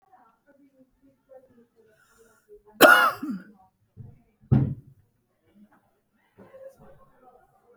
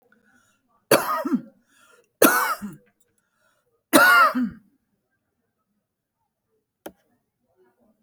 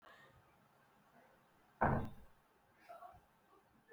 cough_length: 7.8 s
cough_amplitude: 29236
cough_signal_mean_std_ratio: 0.23
three_cough_length: 8.0 s
three_cough_amplitude: 32768
three_cough_signal_mean_std_ratio: 0.31
exhalation_length: 3.9 s
exhalation_amplitude: 3303
exhalation_signal_mean_std_ratio: 0.28
survey_phase: beta (2021-08-13 to 2022-03-07)
age: 65+
gender: Female
wearing_mask: 'No'
symptom_none: true
smoker_status: Ex-smoker
respiratory_condition_asthma: false
respiratory_condition_other: false
recruitment_source: REACT
submission_delay: 1 day
covid_test_result: Negative
covid_test_method: RT-qPCR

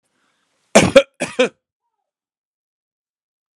cough_length: 3.6 s
cough_amplitude: 32768
cough_signal_mean_std_ratio: 0.23
survey_phase: alpha (2021-03-01 to 2021-08-12)
age: 45-64
gender: Male
wearing_mask: 'No'
symptom_none: true
smoker_status: Ex-smoker
respiratory_condition_asthma: false
respiratory_condition_other: false
recruitment_source: REACT
submission_delay: 1 day
covid_test_result: Negative
covid_test_method: RT-qPCR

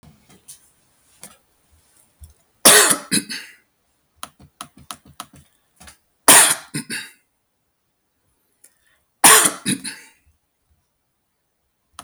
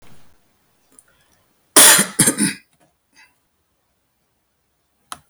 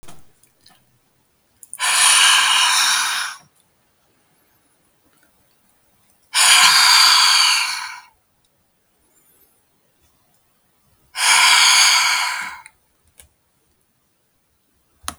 three_cough_length: 12.0 s
three_cough_amplitude: 32768
three_cough_signal_mean_std_ratio: 0.25
cough_length: 5.3 s
cough_amplitude: 32768
cough_signal_mean_std_ratio: 0.26
exhalation_length: 15.2 s
exhalation_amplitude: 32768
exhalation_signal_mean_std_ratio: 0.45
survey_phase: beta (2021-08-13 to 2022-03-07)
age: 45-64
gender: Male
wearing_mask: 'No'
symptom_none: true
smoker_status: Never smoked
respiratory_condition_asthma: false
respiratory_condition_other: false
recruitment_source: REACT
submission_delay: 2 days
covid_test_result: Negative
covid_test_method: RT-qPCR
influenza_a_test_result: Negative
influenza_b_test_result: Negative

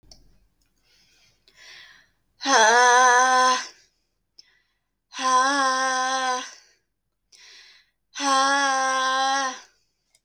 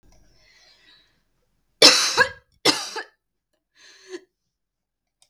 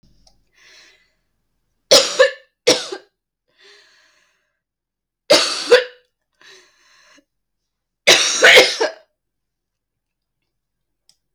exhalation_length: 10.2 s
exhalation_amplitude: 21492
exhalation_signal_mean_std_ratio: 0.51
cough_length: 5.3 s
cough_amplitude: 32768
cough_signal_mean_std_ratio: 0.25
three_cough_length: 11.3 s
three_cough_amplitude: 32768
three_cough_signal_mean_std_ratio: 0.29
survey_phase: beta (2021-08-13 to 2022-03-07)
age: 18-44
gender: Female
wearing_mask: 'No'
symptom_cough_any: true
symptom_runny_or_blocked_nose: true
symptom_shortness_of_breath: true
symptom_sore_throat: true
symptom_fatigue: true
symptom_headache: true
symptom_onset: 4 days
smoker_status: Current smoker (e-cigarettes or vapes only)
respiratory_condition_asthma: false
respiratory_condition_other: false
recruitment_source: REACT
submission_delay: 2 days
covid_test_result: Positive
covid_test_method: RT-qPCR
covid_ct_value: 29.0
covid_ct_gene: E gene
influenza_a_test_result: Unknown/Void
influenza_b_test_result: Unknown/Void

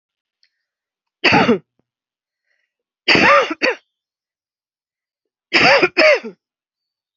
three_cough_length: 7.2 s
three_cough_amplitude: 31432
three_cough_signal_mean_std_ratio: 0.36
survey_phase: beta (2021-08-13 to 2022-03-07)
age: 45-64
gender: Female
wearing_mask: 'No'
symptom_runny_or_blocked_nose: true
smoker_status: Never smoked
respiratory_condition_asthma: false
respiratory_condition_other: false
recruitment_source: REACT
submission_delay: 2 days
covid_test_result: Negative
covid_test_method: RT-qPCR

